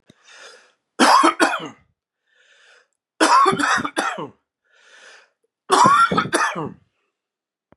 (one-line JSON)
{"three_cough_length": "7.8 s", "three_cough_amplitude": 29555, "three_cough_signal_mean_std_ratio": 0.44, "survey_phase": "beta (2021-08-13 to 2022-03-07)", "age": "45-64", "gender": "Male", "wearing_mask": "No", "symptom_cough_any": true, "symptom_runny_or_blocked_nose": true, "smoker_status": "Ex-smoker", "respiratory_condition_asthma": false, "respiratory_condition_other": false, "recruitment_source": "Test and Trace", "submission_delay": "2 days", "covid_test_result": "Positive", "covid_test_method": "LFT"}